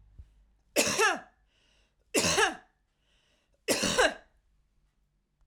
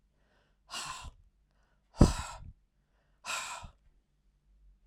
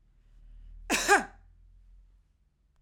{"three_cough_length": "5.5 s", "three_cough_amplitude": 13258, "three_cough_signal_mean_std_ratio": 0.39, "exhalation_length": "4.9 s", "exhalation_amplitude": 17385, "exhalation_signal_mean_std_ratio": 0.23, "cough_length": "2.8 s", "cough_amplitude": 12278, "cough_signal_mean_std_ratio": 0.3, "survey_phase": "alpha (2021-03-01 to 2021-08-12)", "age": "45-64", "gender": "Female", "wearing_mask": "No", "symptom_fatigue": true, "smoker_status": "Never smoked", "respiratory_condition_asthma": false, "respiratory_condition_other": false, "recruitment_source": "Test and Trace", "submission_delay": "2 days", "covid_test_result": "Positive", "covid_test_method": "RT-qPCR", "covid_ct_value": 28.3, "covid_ct_gene": "S gene", "covid_ct_mean": 28.7, "covid_viral_load": "400 copies/ml", "covid_viral_load_category": "Minimal viral load (< 10K copies/ml)"}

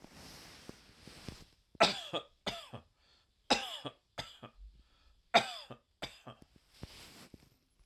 {"three_cough_length": "7.9 s", "three_cough_amplitude": 7945, "three_cough_signal_mean_std_ratio": 0.28, "survey_phase": "alpha (2021-03-01 to 2021-08-12)", "age": "45-64", "gender": "Male", "wearing_mask": "No", "symptom_none": true, "smoker_status": "Ex-smoker", "respiratory_condition_asthma": false, "respiratory_condition_other": false, "recruitment_source": "REACT", "submission_delay": "1 day", "covid_test_result": "Negative", "covid_test_method": "RT-qPCR"}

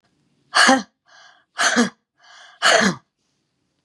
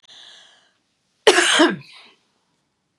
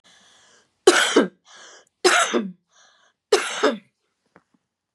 {"exhalation_length": "3.8 s", "exhalation_amplitude": 32767, "exhalation_signal_mean_std_ratio": 0.39, "cough_length": "3.0 s", "cough_amplitude": 32767, "cough_signal_mean_std_ratio": 0.32, "three_cough_length": "4.9 s", "three_cough_amplitude": 30820, "three_cough_signal_mean_std_ratio": 0.36, "survey_phase": "beta (2021-08-13 to 2022-03-07)", "age": "65+", "gender": "Female", "wearing_mask": "No", "symptom_cough_any": true, "symptom_runny_or_blocked_nose": true, "symptom_sore_throat": true, "symptom_onset": "8 days", "smoker_status": "Never smoked", "respiratory_condition_asthma": false, "respiratory_condition_other": false, "recruitment_source": "REACT", "submission_delay": "1 day", "covid_test_result": "Negative", "covid_test_method": "RT-qPCR", "influenza_a_test_result": "Unknown/Void", "influenza_b_test_result": "Unknown/Void"}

